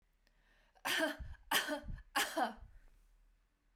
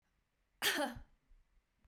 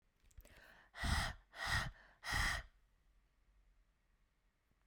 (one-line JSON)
{"three_cough_length": "3.8 s", "three_cough_amplitude": 4392, "three_cough_signal_mean_std_ratio": 0.47, "cough_length": "1.9 s", "cough_amplitude": 3275, "cough_signal_mean_std_ratio": 0.36, "exhalation_length": "4.9 s", "exhalation_amplitude": 1988, "exhalation_signal_mean_std_ratio": 0.41, "survey_phase": "beta (2021-08-13 to 2022-03-07)", "age": "18-44", "gender": "Female", "wearing_mask": "No", "symptom_none": true, "smoker_status": "Ex-smoker", "respiratory_condition_asthma": false, "respiratory_condition_other": false, "recruitment_source": "REACT", "submission_delay": "5 days", "covid_test_result": "Negative", "covid_test_method": "RT-qPCR"}